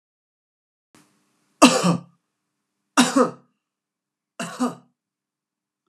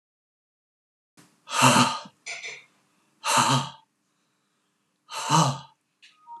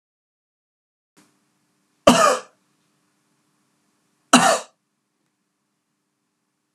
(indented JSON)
{
  "three_cough_length": "5.9 s",
  "three_cough_amplitude": 32767,
  "three_cough_signal_mean_std_ratio": 0.26,
  "exhalation_length": "6.4 s",
  "exhalation_amplitude": 18617,
  "exhalation_signal_mean_std_ratio": 0.37,
  "cough_length": "6.7 s",
  "cough_amplitude": 32767,
  "cough_signal_mean_std_ratio": 0.22,
  "survey_phase": "alpha (2021-03-01 to 2021-08-12)",
  "age": "45-64",
  "gender": "Male",
  "wearing_mask": "No",
  "symptom_none": true,
  "smoker_status": "Never smoked",
  "respiratory_condition_asthma": false,
  "respiratory_condition_other": false,
  "recruitment_source": "REACT",
  "submission_delay": "3 days",
  "covid_test_result": "Negative",
  "covid_test_method": "RT-qPCR"
}